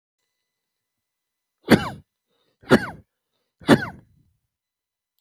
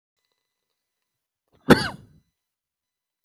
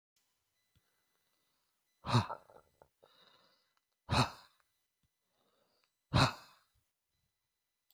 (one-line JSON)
{"three_cough_length": "5.2 s", "three_cough_amplitude": 28970, "three_cough_signal_mean_std_ratio": 0.2, "cough_length": "3.2 s", "cough_amplitude": 30594, "cough_signal_mean_std_ratio": 0.15, "exhalation_length": "7.9 s", "exhalation_amplitude": 5851, "exhalation_signal_mean_std_ratio": 0.22, "survey_phase": "beta (2021-08-13 to 2022-03-07)", "age": "45-64", "gender": "Male", "wearing_mask": "No", "symptom_none": true, "smoker_status": "Never smoked", "respiratory_condition_asthma": false, "respiratory_condition_other": true, "recruitment_source": "REACT", "submission_delay": "1 day", "covid_test_result": "Negative", "covid_test_method": "RT-qPCR"}